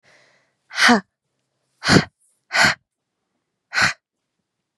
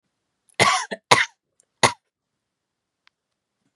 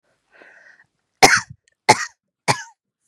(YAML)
exhalation_length: 4.8 s
exhalation_amplitude: 32145
exhalation_signal_mean_std_ratio: 0.31
cough_length: 3.8 s
cough_amplitude: 32768
cough_signal_mean_std_ratio: 0.25
three_cough_length: 3.1 s
three_cough_amplitude: 32768
three_cough_signal_mean_std_ratio: 0.25
survey_phase: beta (2021-08-13 to 2022-03-07)
age: 18-44
gender: Female
wearing_mask: 'No'
symptom_sore_throat: true
symptom_diarrhoea: true
symptom_fatigue: true
smoker_status: Never smoked
respiratory_condition_asthma: false
respiratory_condition_other: false
recruitment_source: REACT
submission_delay: 3 days
covid_test_result: Negative
covid_test_method: RT-qPCR
influenza_a_test_result: Negative
influenza_b_test_result: Negative